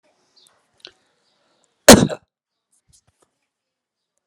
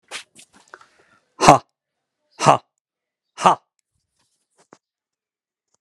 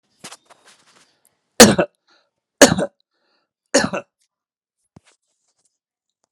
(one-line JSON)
{"cough_length": "4.3 s", "cough_amplitude": 32768, "cough_signal_mean_std_ratio": 0.16, "exhalation_length": "5.8 s", "exhalation_amplitude": 32768, "exhalation_signal_mean_std_ratio": 0.2, "three_cough_length": "6.3 s", "three_cough_amplitude": 32768, "three_cough_signal_mean_std_ratio": 0.21, "survey_phase": "alpha (2021-03-01 to 2021-08-12)", "age": "45-64", "gender": "Male", "wearing_mask": "No", "symptom_none": true, "smoker_status": "Never smoked", "respiratory_condition_asthma": false, "respiratory_condition_other": false, "recruitment_source": "REACT", "submission_delay": "2 days", "covid_test_result": "Negative", "covid_test_method": "RT-qPCR"}